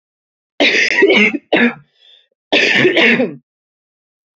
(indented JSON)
{
  "cough_length": "4.4 s",
  "cough_amplitude": 32767,
  "cough_signal_mean_std_ratio": 0.55,
  "survey_phase": "beta (2021-08-13 to 2022-03-07)",
  "age": "18-44",
  "gender": "Female",
  "wearing_mask": "No",
  "symptom_cough_any": true,
  "symptom_new_continuous_cough": true,
  "symptom_runny_or_blocked_nose": true,
  "symptom_sore_throat": true,
  "symptom_fatigue": true,
  "symptom_fever_high_temperature": true,
  "symptom_headache": true,
  "symptom_onset": "2 days",
  "smoker_status": "Ex-smoker",
  "respiratory_condition_asthma": false,
  "respiratory_condition_other": false,
  "recruitment_source": "Test and Trace",
  "submission_delay": "1 day",
  "covid_test_result": "Positive",
  "covid_test_method": "RT-qPCR",
  "covid_ct_value": 19.2,
  "covid_ct_gene": "ORF1ab gene"
}